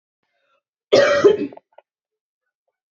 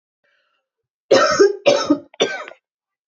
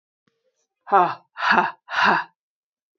{
  "cough_length": "2.9 s",
  "cough_amplitude": 27717,
  "cough_signal_mean_std_ratio": 0.33,
  "three_cough_length": "3.1 s",
  "three_cough_amplitude": 27871,
  "three_cough_signal_mean_std_ratio": 0.42,
  "exhalation_length": "3.0 s",
  "exhalation_amplitude": 24419,
  "exhalation_signal_mean_std_ratio": 0.41,
  "survey_phase": "beta (2021-08-13 to 2022-03-07)",
  "age": "18-44",
  "gender": "Female",
  "wearing_mask": "No",
  "symptom_runny_or_blocked_nose": true,
  "symptom_onset": "4 days",
  "smoker_status": "Never smoked",
  "respiratory_condition_asthma": false,
  "respiratory_condition_other": false,
  "recruitment_source": "REACT",
  "submission_delay": "1 day",
  "covid_test_result": "Negative",
  "covid_test_method": "RT-qPCR",
  "influenza_a_test_result": "Negative",
  "influenza_b_test_result": "Negative"
}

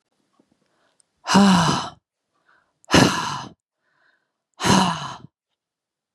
{
  "exhalation_length": "6.1 s",
  "exhalation_amplitude": 30737,
  "exhalation_signal_mean_std_ratio": 0.37,
  "survey_phase": "beta (2021-08-13 to 2022-03-07)",
  "age": "18-44",
  "gender": "Female",
  "wearing_mask": "No",
  "symptom_cough_any": true,
  "symptom_onset": "5 days",
  "smoker_status": "Never smoked",
  "respiratory_condition_asthma": true,
  "respiratory_condition_other": false,
  "recruitment_source": "REACT",
  "submission_delay": "2 days",
  "covid_test_result": "Negative",
  "covid_test_method": "RT-qPCR",
  "influenza_a_test_result": "Negative",
  "influenza_b_test_result": "Negative"
}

